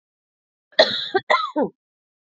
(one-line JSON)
{"cough_length": "2.2 s", "cough_amplitude": 29000, "cough_signal_mean_std_ratio": 0.38, "survey_phase": "beta (2021-08-13 to 2022-03-07)", "age": "45-64", "gender": "Female", "wearing_mask": "No", "symptom_cough_any": true, "symptom_runny_or_blocked_nose": true, "symptom_sore_throat": true, "symptom_abdominal_pain": true, "symptom_fatigue": true, "symptom_fever_high_temperature": true, "symptom_headache": true, "symptom_onset": "3 days", "smoker_status": "Ex-smoker", "respiratory_condition_asthma": false, "respiratory_condition_other": false, "recruitment_source": "Test and Trace", "submission_delay": "1 day", "covid_test_result": "Positive", "covid_test_method": "ePCR"}